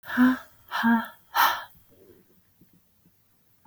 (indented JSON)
{
  "exhalation_length": "3.7 s",
  "exhalation_amplitude": 13838,
  "exhalation_signal_mean_std_ratio": 0.4,
  "survey_phase": "alpha (2021-03-01 to 2021-08-12)",
  "age": "45-64",
  "gender": "Female",
  "wearing_mask": "No",
  "symptom_none": true,
  "smoker_status": "Never smoked",
  "respiratory_condition_asthma": false,
  "respiratory_condition_other": false,
  "recruitment_source": "REACT",
  "submission_delay": "1 day",
  "covid_test_result": "Negative",
  "covid_test_method": "RT-qPCR"
}